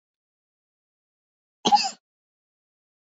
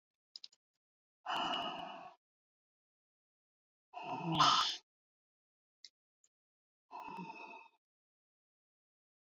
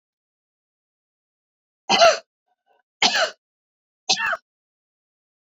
cough_length: 3.1 s
cough_amplitude: 14916
cough_signal_mean_std_ratio: 0.19
exhalation_length: 9.2 s
exhalation_amplitude: 4484
exhalation_signal_mean_std_ratio: 0.3
three_cough_length: 5.5 s
three_cough_amplitude: 26891
three_cough_signal_mean_std_ratio: 0.28
survey_phase: beta (2021-08-13 to 2022-03-07)
age: 65+
gender: Female
wearing_mask: 'No'
symptom_none: true
smoker_status: Ex-smoker
respiratory_condition_asthma: false
respiratory_condition_other: false
recruitment_source: REACT
submission_delay: 1 day
covid_test_result: Negative
covid_test_method: RT-qPCR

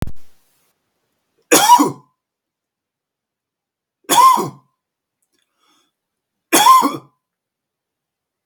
three_cough_length: 8.5 s
three_cough_amplitude: 32768
three_cough_signal_mean_std_ratio: 0.32
survey_phase: beta (2021-08-13 to 2022-03-07)
age: 18-44
gender: Male
wearing_mask: 'No'
symptom_none: true
smoker_status: Never smoked
respiratory_condition_asthma: false
respiratory_condition_other: false
recruitment_source: REACT
submission_delay: 0 days
covid_test_result: Negative
covid_test_method: RT-qPCR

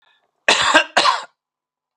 cough_length: 2.0 s
cough_amplitude: 32768
cough_signal_mean_std_ratio: 0.43
survey_phase: beta (2021-08-13 to 2022-03-07)
age: 65+
gender: Male
wearing_mask: 'No'
symptom_none: true
smoker_status: Never smoked
respiratory_condition_asthma: false
respiratory_condition_other: false
recruitment_source: REACT
submission_delay: 0 days
covid_test_result: Negative
covid_test_method: RT-qPCR
influenza_a_test_result: Negative
influenza_b_test_result: Negative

